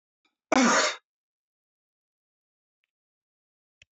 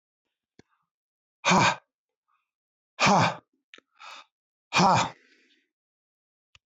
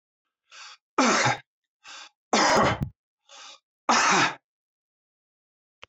{
  "cough_length": "3.9 s",
  "cough_amplitude": 11633,
  "cough_signal_mean_std_ratio": 0.25,
  "exhalation_length": "6.7 s",
  "exhalation_amplitude": 12584,
  "exhalation_signal_mean_std_ratio": 0.31,
  "three_cough_length": "5.9 s",
  "three_cough_amplitude": 14267,
  "three_cough_signal_mean_std_ratio": 0.41,
  "survey_phase": "beta (2021-08-13 to 2022-03-07)",
  "age": "65+",
  "gender": "Male",
  "wearing_mask": "No",
  "symptom_none": true,
  "smoker_status": "Ex-smoker",
  "respiratory_condition_asthma": false,
  "respiratory_condition_other": false,
  "recruitment_source": "REACT",
  "submission_delay": "2 days",
  "covid_test_result": "Negative",
  "covid_test_method": "RT-qPCR"
}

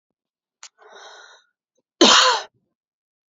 {
  "cough_length": "3.3 s",
  "cough_amplitude": 30675,
  "cough_signal_mean_std_ratio": 0.28,
  "survey_phase": "beta (2021-08-13 to 2022-03-07)",
  "age": "18-44",
  "gender": "Female",
  "wearing_mask": "No",
  "symptom_none": true,
  "smoker_status": "Ex-smoker",
  "respiratory_condition_asthma": false,
  "respiratory_condition_other": false,
  "recruitment_source": "REACT",
  "submission_delay": "2 days",
  "covid_test_result": "Negative",
  "covid_test_method": "RT-qPCR",
  "covid_ct_value": 38.5,
  "covid_ct_gene": "N gene",
  "influenza_a_test_result": "Negative",
  "influenza_b_test_result": "Negative"
}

